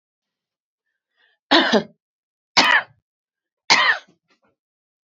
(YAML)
three_cough_length: 5.0 s
three_cough_amplitude: 32767
three_cough_signal_mean_std_ratio: 0.31
survey_phase: beta (2021-08-13 to 2022-03-07)
age: 45-64
gender: Female
wearing_mask: 'No'
symptom_none: true
smoker_status: Ex-smoker
respiratory_condition_asthma: false
respiratory_condition_other: false
recruitment_source: REACT
submission_delay: 2 days
covid_test_result: Negative
covid_test_method: RT-qPCR
influenza_a_test_result: Negative
influenza_b_test_result: Negative